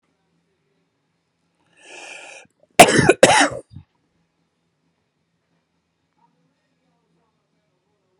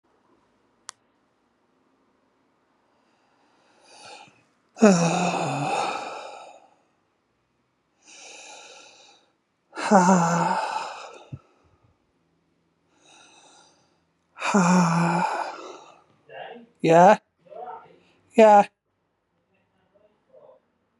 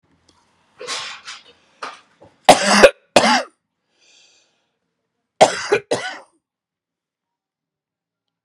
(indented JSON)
{
  "cough_length": "8.2 s",
  "cough_amplitude": 32768,
  "cough_signal_mean_std_ratio": 0.2,
  "exhalation_length": "21.0 s",
  "exhalation_amplitude": 28247,
  "exhalation_signal_mean_std_ratio": 0.33,
  "three_cough_length": "8.4 s",
  "three_cough_amplitude": 32768,
  "three_cough_signal_mean_std_ratio": 0.27,
  "survey_phase": "beta (2021-08-13 to 2022-03-07)",
  "age": "45-64",
  "gender": "Female",
  "wearing_mask": "No",
  "symptom_cough_any": true,
  "symptom_runny_or_blocked_nose": true,
  "symptom_shortness_of_breath": true,
  "symptom_sore_throat": true,
  "symptom_abdominal_pain": true,
  "symptom_diarrhoea": true,
  "symptom_fatigue": true,
  "symptom_fever_high_temperature": true,
  "symptom_headache": true,
  "symptom_change_to_sense_of_smell_or_taste": true,
  "symptom_loss_of_taste": true,
  "symptom_onset": "7 days",
  "smoker_status": "Current smoker (e-cigarettes or vapes only)",
  "respiratory_condition_asthma": true,
  "respiratory_condition_other": false,
  "recruitment_source": "Test and Trace",
  "submission_delay": "2 days",
  "covid_test_result": "Positive",
  "covid_test_method": "RT-qPCR",
  "covid_ct_value": 19.6,
  "covid_ct_gene": "ORF1ab gene",
  "covid_ct_mean": 20.2,
  "covid_viral_load": "250000 copies/ml",
  "covid_viral_load_category": "Low viral load (10K-1M copies/ml)"
}